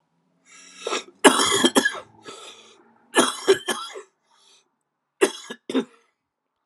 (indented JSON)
{
  "three_cough_length": "6.7 s",
  "three_cough_amplitude": 32220,
  "three_cough_signal_mean_std_ratio": 0.35,
  "survey_phase": "alpha (2021-03-01 to 2021-08-12)",
  "age": "45-64",
  "gender": "Male",
  "wearing_mask": "No",
  "symptom_cough_any": true,
  "symptom_fatigue": true,
  "symptom_headache": true,
  "symptom_onset": "64 days",
  "smoker_status": "Never smoked",
  "respiratory_condition_asthma": false,
  "respiratory_condition_other": false,
  "recruitment_source": "Test and Trace",
  "submission_delay": "2 days",
  "covid_test_result": "Positive",
  "covid_test_method": "ePCR"
}